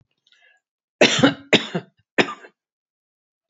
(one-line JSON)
{"three_cough_length": "3.5 s", "three_cough_amplitude": 29107, "three_cough_signal_mean_std_ratio": 0.29, "survey_phase": "beta (2021-08-13 to 2022-03-07)", "age": "65+", "gender": "Female", "wearing_mask": "No", "symptom_none": true, "smoker_status": "Ex-smoker", "respiratory_condition_asthma": true, "respiratory_condition_other": false, "recruitment_source": "REACT", "submission_delay": "3 days", "covid_test_result": "Negative", "covid_test_method": "RT-qPCR", "influenza_a_test_result": "Negative", "influenza_b_test_result": "Negative"}